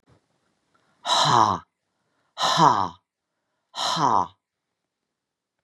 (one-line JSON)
{"exhalation_length": "5.6 s", "exhalation_amplitude": 25210, "exhalation_signal_mean_std_ratio": 0.39, "survey_phase": "beta (2021-08-13 to 2022-03-07)", "age": "65+", "gender": "Female", "wearing_mask": "No", "symptom_cough_any": true, "symptom_runny_or_blocked_nose": true, "symptom_sore_throat": true, "symptom_fatigue": true, "symptom_onset": "3 days", "smoker_status": "Never smoked", "respiratory_condition_asthma": false, "respiratory_condition_other": false, "recruitment_source": "Test and Trace", "submission_delay": "1 day", "covid_test_result": "Positive", "covid_test_method": "ePCR"}